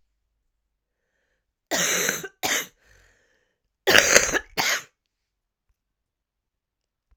{
  "cough_length": "7.2 s",
  "cough_amplitude": 32768,
  "cough_signal_mean_std_ratio": 0.31,
  "survey_phase": "alpha (2021-03-01 to 2021-08-12)",
  "age": "45-64",
  "gender": "Female",
  "wearing_mask": "No",
  "symptom_cough_any": true,
  "symptom_shortness_of_breath": true,
  "symptom_fatigue": true,
  "symptom_headache": true,
  "symptom_change_to_sense_of_smell_or_taste": true,
  "symptom_loss_of_taste": true,
  "smoker_status": "Never smoked",
  "respiratory_condition_asthma": true,
  "respiratory_condition_other": false,
  "recruitment_source": "Test and Trace",
  "submission_delay": "1 day",
  "covid_test_result": "Positive",
  "covid_test_method": "RT-qPCR",
  "covid_ct_value": 18.8,
  "covid_ct_gene": "ORF1ab gene",
  "covid_ct_mean": 19.6,
  "covid_viral_load": "370000 copies/ml",
  "covid_viral_load_category": "Low viral load (10K-1M copies/ml)"
}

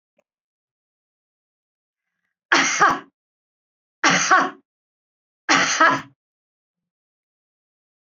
{
  "three_cough_length": "8.2 s",
  "three_cough_amplitude": 27448,
  "three_cough_signal_mean_std_ratio": 0.32,
  "survey_phase": "beta (2021-08-13 to 2022-03-07)",
  "age": "45-64",
  "gender": "Female",
  "wearing_mask": "No",
  "symptom_none": true,
  "smoker_status": "Never smoked",
  "respiratory_condition_asthma": false,
  "respiratory_condition_other": false,
  "recruitment_source": "REACT",
  "submission_delay": "3 days",
  "covid_test_result": "Negative",
  "covid_test_method": "RT-qPCR"
}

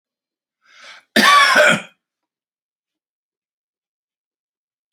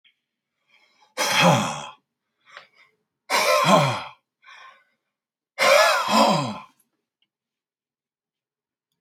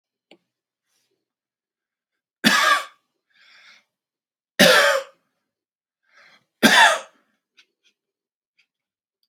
{
  "cough_length": "4.9 s",
  "cough_amplitude": 30442,
  "cough_signal_mean_std_ratio": 0.3,
  "exhalation_length": "9.0 s",
  "exhalation_amplitude": 26940,
  "exhalation_signal_mean_std_ratio": 0.4,
  "three_cough_length": "9.3 s",
  "three_cough_amplitude": 31580,
  "three_cough_signal_mean_std_ratio": 0.28,
  "survey_phase": "beta (2021-08-13 to 2022-03-07)",
  "age": "45-64",
  "gender": "Male",
  "wearing_mask": "No",
  "symptom_none": true,
  "smoker_status": "Never smoked",
  "respiratory_condition_asthma": false,
  "respiratory_condition_other": false,
  "recruitment_source": "REACT",
  "submission_delay": "1 day",
  "covid_test_result": "Negative",
  "covid_test_method": "RT-qPCR"
}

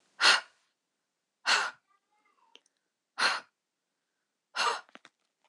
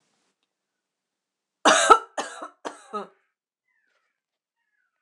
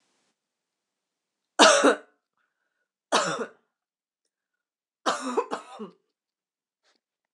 {
  "exhalation_length": "5.5 s",
  "exhalation_amplitude": 12945,
  "exhalation_signal_mean_std_ratio": 0.29,
  "cough_length": "5.0 s",
  "cough_amplitude": 26027,
  "cough_signal_mean_std_ratio": 0.22,
  "three_cough_length": "7.3 s",
  "three_cough_amplitude": 25585,
  "three_cough_signal_mean_std_ratio": 0.26,
  "survey_phase": "alpha (2021-03-01 to 2021-08-12)",
  "age": "18-44",
  "gender": "Female",
  "wearing_mask": "No",
  "symptom_fatigue": true,
  "smoker_status": "Never smoked",
  "respiratory_condition_asthma": false,
  "respiratory_condition_other": false,
  "recruitment_source": "REACT",
  "submission_delay": "2 days",
  "covid_test_result": "Negative",
  "covid_test_method": "RT-qPCR"
}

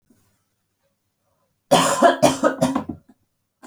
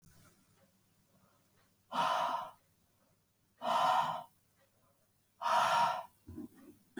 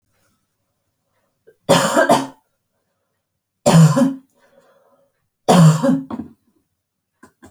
{
  "cough_length": "3.7 s",
  "cough_amplitude": 28952,
  "cough_signal_mean_std_ratio": 0.39,
  "exhalation_length": "7.0 s",
  "exhalation_amplitude": 4016,
  "exhalation_signal_mean_std_ratio": 0.44,
  "three_cough_length": "7.5 s",
  "three_cough_amplitude": 28749,
  "three_cough_signal_mean_std_ratio": 0.37,
  "survey_phase": "alpha (2021-03-01 to 2021-08-12)",
  "age": "18-44",
  "gender": "Female",
  "wearing_mask": "No",
  "symptom_none": true,
  "smoker_status": "Never smoked",
  "respiratory_condition_asthma": false,
  "respiratory_condition_other": false,
  "recruitment_source": "REACT",
  "submission_delay": "6 days",
  "covid_test_result": "Negative",
  "covid_test_method": "RT-qPCR"
}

